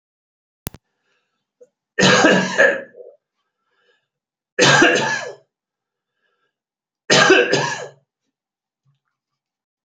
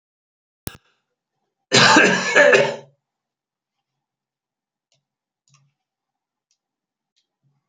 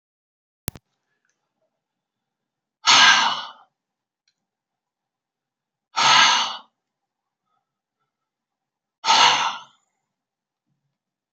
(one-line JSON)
{"three_cough_length": "9.9 s", "three_cough_amplitude": 32768, "three_cough_signal_mean_std_ratio": 0.36, "cough_length": "7.7 s", "cough_amplitude": 30468, "cough_signal_mean_std_ratio": 0.28, "exhalation_length": "11.3 s", "exhalation_amplitude": 32768, "exhalation_signal_mean_std_ratio": 0.29, "survey_phase": "beta (2021-08-13 to 2022-03-07)", "age": "45-64", "gender": "Male", "wearing_mask": "No", "symptom_none": true, "smoker_status": "Never smoked", "respiratory_condition_asthma": false, "respiratory_condition_other": false, "recruitment_source": "REACT", "submission_delay": "1 day", "covid_test_result": "Negative", "covid_test_method": "RT-qPCR"}